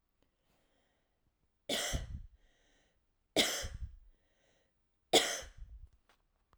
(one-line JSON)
{"three_cough_length": "6.6 s", "three_cough_amplitude": 7679, "three_cough_signal_mean_std_ratio": 0.31, "survey_phase": "alpha (2021-03-01 to 2021-08-12)", "age": "18-44", "gender": "Female", "wearing_mask": "No", "symptom_none": true, "smoker_status": "Never smoked", "respiratory_condition_asthma": false, "respiratory_condition_other": false, "recruitment_source": "REACT", "submission_delay": "1 day", "covid_test_result": "Negative", "covid_test_method": "RT-qPCR"}